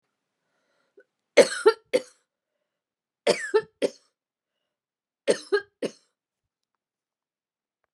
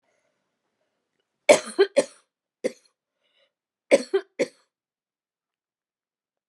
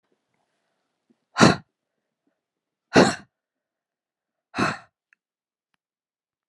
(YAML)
three_cough_length: 7.9 s
three_cough_amplitude: 24557
three_cough_signal_mean_std_ratio: 0.22
cough_length: 6.5 s
cough_amplitude: 29621
cough_signal_mean_std_ratio: 0.2
exhalation_length: 6.5 s
exhalation_amplitude: 29584
exhalation_signal_mean_std_ratio: 0.2
survey_phase: alpha (2021-03-01 to 2021-08-12)
age: 65+
gender: Female
wearing_mask: 'No'
symptom_none: true
smoker_status: Ex-smoker
respiratory_condition_asthma: false
respiratory_condition_other: false
recruitment_source: REACT
submission_delay: 3 days
covid_test_result: Negative
covid_test_method: RT-qPCR